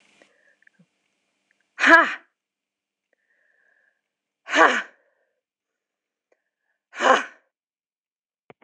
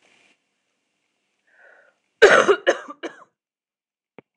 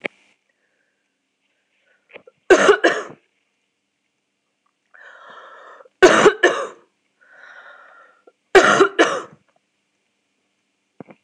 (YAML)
exhalation_length: 8.6 s
exhalation_amplitude: 26028
exhalation_signal_mean_std_ratio: 0.22
cough_length: 4.4 s
cough_amplitude: 26028
cough_signal_mean_std_ratio: 0.24
three_cough_length: 11.2 s
three_cough_amplitude: 26028
three_cough_signal_mean_std_ratio: 0.28
survey_phase: alpha (2021-03-01 to 2021-08-12)
age: 45-64
gender: Female
wearing_mask: 'No'
symptom_cough_any: true
symptom_shortness_of_breath: true
symptom_fatigue: true
symptom_headache: true
symptom_onset: 5 days
smoker_status: Never smoked
respiratory_condition_asthma: true
respiratory_condition_other: false
recruitment_source: REACT
submission_delay: 1 day
covid_test_result: Negative
covid_test_method: RT-qPCR